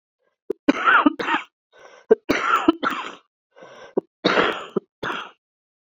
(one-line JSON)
{"three_cough_length": "5.9 s", "three_cough_amplitude": 30097, "three_cough_signal_mean_std_ratio": 0.42, "survey_phase": "beta (2021-08-13 to 2022-03-07)", "age": "45-64", "gender": "Female", "wearing_mask": "No", "symptom_cough_any": true, "symptom_new_continuous_cough": true, "symptom_runny_or_blocked_nose": true, "symptom_shortness_of_breath": true, "symptom_fatigue": true, "symptom_headache": true, "symptom_change_to_sense_of_smell_or_taste": true, "symptom_loss_of_taste": true, "symptom_onset": "4 days", "smoker_status": "Never smoked", "respiratory_condition_asthma": true, "respiratory_condition_other": false, "recruitment_source": "Test and Trace", "submission_delay": "2 days", "covid_test_result": "Positive", "covid_test_method": "RT-qPCR", "covid_ct_value": 16.9, "covid_ct_gene": "ORF1ab gene", "covid_ct_mean": 17.2, "covid_viral_load": "2200000 copies/ml", "covid_viral_load_category": "High viral load (>1M copies/ml)"}